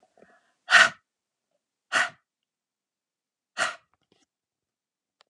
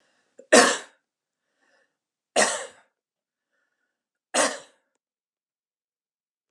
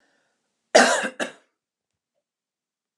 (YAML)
exhalation_length: 5.3 s
exhalation_amplitude: 28183
exhalation_signal_mean_std_ratio: 0.2
three_cough_length: 6.5 s
three_cough_amplitude: 28918
three_cough_signal_mean_std_ratio: 0.23
cough_length: 3.0 s
cough_amplitude: 28002
cough_signal_mean_std_ratio: 0.25
survey_phase: alpha (2021-03-01 to 2021-08-12)
age: 45-64
gender: Female
wearing_mask: 'No'
symptom_none: true
smoker_status: Never smoked
respiratory_condition_asthma: false
respiratory_condition_other: false
recruitment_source: REACT
submission_delay: 1 day
covid_test_result: Negative
covid_test_method: RT-qPCR